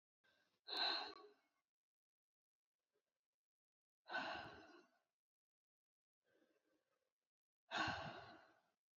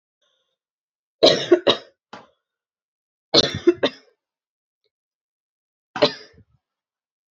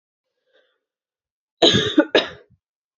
{"exhalation_length": "9.0 s", "exhalation_amplitude": 1196, "exhalation_signal_mean_std_ratio": 0.32, "three_cough_length": "7.3 s", "three_cough_amplitude": 31262, "three_cough_signal_mean_std_ratio": 0.24, "cough_length": "3.0 s", "cough_amplitude": 28191, "cough_signal_mean_std_ratio": 0.3, "survey_phase": "beta (2021-08-13 to 2022-03-07)", "age": "18-44", "gender": "Female", "wearing_mask": "No", "symptom_cough_any": true, "symptom_runny_or_blocked_nose": true, "symptom_fever_high_temperature": true, "symptom_headache": true, "symptom_change_to_sense_of_smell_or_taste": true, "symptom_onset": "2 days", "smoker_status": "Never smoked", "respiratory_condition_asthma": false, "respiratory_condition_other": false, "recruitment_source": "Test and Trace", "submission_delay": "1 day", "covid_test_result": "Positive", "covid_test_method": "RT-qPCR", "covid_ct_value": 34.7, "covid_ct_gene": "ORF1ab gene"}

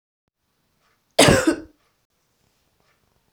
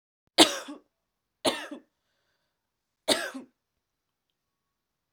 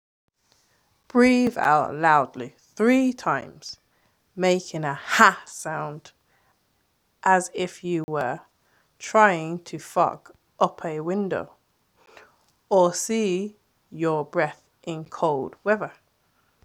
{"cough_length": "3.3 s", "cough_amplitude": 32768, "cough_signal_mean_std_ratio": 0.25, "three_cough_length": "5.1 s", "three_cough_amplitude": 23077, "three_cough_signal_mean_std_ratio": 0.21, "exhalation_length": "16.6 s", "exhalation_amplitude": 32750, "exhalation_signal_mean_std_ratio": 0.48, "survey_phase": "beta (2021-08-13 to 2022-03-07)", "age": "18-44", "gender": "Female", "wearing_mask": "No", "symptom_none": true, "smoker_status": "Never smoked", "respiratory_condition_asthma": false, "respiratory_condition_other": false, "recruitment_source": "REACT", "submission_delay": "5 days", "covid_test_result": "Negative", "covid_test_method": "RT-qPCR"}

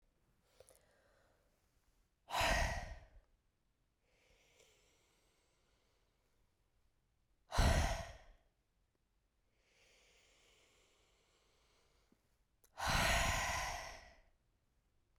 {"exhalation_length": "15.2 s", "exhalation_amplitude": 3104, "exhalation_signal_mean_std_ratio": 0.31, "survey_phase": "beta (2021-08-13 to 2022-03-07)", "age": "18-44", "gender": "Female", "wearing_mask": "No", "symptom_cough_any": true, "symptom_runny_or_blocked_nose": true, "symptom_fatigue": true, "symptom_change_to_sense_of_smell_or_taste": true, "smoker_status": "Never smoked", "respiratory_condition_asthma": false, "respiratory_condition_other": false, "recruitment_source": "Test and Trace", "submission_delay": "2 days", "covid_test_result": "Positive", "covid_test_method": "LFT"}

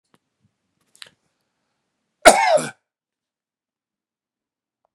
{"cough_length": "4.9 s", "cough_amplitude": 32768, "cough_signal_mean_std_ratio": 0.19, "survey_phase": "beta (2021-08-13 to 2022-03-07)", "age": "18-44", "gender": "Male", "wearing_mask": "No", "symptom_none": true, "smoker_status": "Never smoked", "respiratory_condition_asthma": false, "respiratory_condition_other": false, "recruitment_source": "REACT", "submission_delay": "2 days", "covid_test_result": "Negative", "covid_test_method": "RT-qPCR", "influenza_a_test_result": "Unknown/Void", "influenza_b_test_result": "Unknown/Void"}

